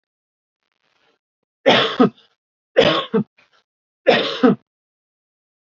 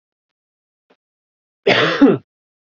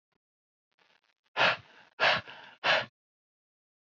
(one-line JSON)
{"three_cough_length": "5.7 s", "three_cough_amplitude": 28822, "three_cough_signal_mean_std_ratio": 0.34, "cough_length": "2.7 s", "cough_amplitude": 28613, "cough_signal_mean_std_ratio": 0.33, "exhalation_length": "3.8 s", "exhalation_amplitude": 9126, "exhalation_signal_mean_std_ratio": 0.32, "survey_phase": "beta (2021-08-13 to 2022-03-07)", "age": "18-44", "gender": "Male", "wearing_mask": "No", "symptom_runny_or_blocked_nose": true, "symptom_onset": "5 days", "smoker_status": "Never smoked", "recruitment_source": "REACT", "submission_delay": "1 day", "covid_test_result": "Negative", "covid_test_method": "RT-qPCR", "influenza_a_test_result": "Unknown/Void", "influenza_b_test_result": "Unknown/Void"}